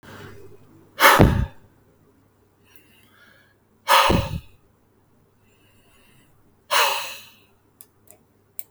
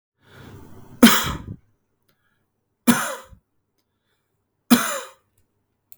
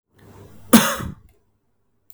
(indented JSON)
{
  "exhalation_length": "8.7 s",
  "exhalation_amplitude": 32768,
  "exhalation_signal_mean_std_ratio": 0.3,
  "three_cough_length": "6.0 s",
  "three_cough_amplitude": 32768,
  "three_cough_signal_mean_std_ratio": 0.26,
  "cough_length": "2.1 s",
  "cough_amplitude": 32768,
  "cough_signal_mean_std_ratio": 0.27,
  "survey_phase": "beta (2021-08-13 to 2022-03-07)",
  "age": "45-64",
  "gender": "Male",
  "wearing_mask": "No",
  "symptom_none": true,
  "smoker_status": "Never smoked",
  "respiratory_condition_asthma": false,
  "respiratory_condition_other": false,
  "recruitment_source": "REACT",
  "submission_delay": "1 day",
  "covid_test_result": "Negative",
  "covid_test_method": "RT-qPCR"
}